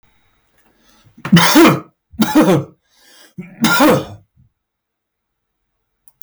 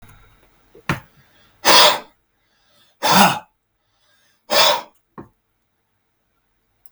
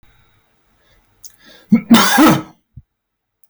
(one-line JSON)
{"three_cough_length": "6.2 s", "three_cough_amplitude": 32768, "three_cough_signal_mean_std_ratio": 0.4, "exhalation_length": "6.9 s", "exhalation_amplitude": 32768, "exhalation_signal_mean_std_ratio": 0.31, "cough_length": "3.5 s", "cough_amplitude": 32768, "cough_signal_mean_std_ratio": 0.36, "survey_phase": "beta (2021-08-13 to 2022-03-07)", "age": "45-64", "gender": "Male", "wearing_mask": "No", "symptom_none": true, "smoker_status": "Ex-smoker", "recruitment_source": "REACT", "submission_delay": "1 day", "covid_test_result": "Negative", "covid_test_method": "RT-qPCR", "influenza_a_test_result": "Unknown/Void", "influenza_b_test_result": "Unknown/Void"}